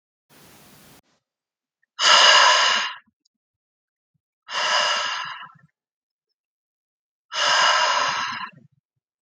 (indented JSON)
{
  "exhalation_length": "9.2 s",
  "exhalation_amplitude": 31382,
  "exhalation_signal_mean_std_ratio": 0.43,
  "survey_phase": "beta (2021-08-13 to 2022-03-07)",
  "age": "18-44",
  "gender": "Male",
  "wearing_mask": "No",
  "symptom_none": true,
  "smoker_status": "Never smoked",
  "respiratory_condition_asthma": false,
  "respiratory_condition_other": false,
  "recruitment_source": "REACT",
  "submission_delay": "2 days",
  "covid_test_result": "Negative",
  "covid_test_method": "RT-qPCR",
  "influenza_a_test_result": "Negative",
  "influenza_b_test_result": "Negative"
}